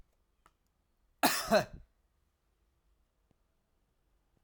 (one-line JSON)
{"cough_length": "4.4 s", "cough_amplitude": 8612, "cough_signal_mean_std_ratio": 0.22, "survey_phase": "alpha (2021-03-01 to 2021-08-12)", "age": "45-64", "gender": "Male", "wearing_mask": "No", "symptom_cough_any": true, "smoker_status": "Never smoked", "respiratory_condition_asthma": false, "respiratory_condition_other": false, "recruitment_source": "Test and Trace", "submission_delay": "2 days", "covid_test_result": "Positive", "covid_test_method": "RT-qPCR", "covid_ct_value": 29.4, "covid_ct_gene": "ORF1ab gene", "covid_ct_mean": 29.9, "covid_viral_load": "160 copies/ml", "covid_viral_load_category": "Minimal viral load (< 10K copies/ml)"}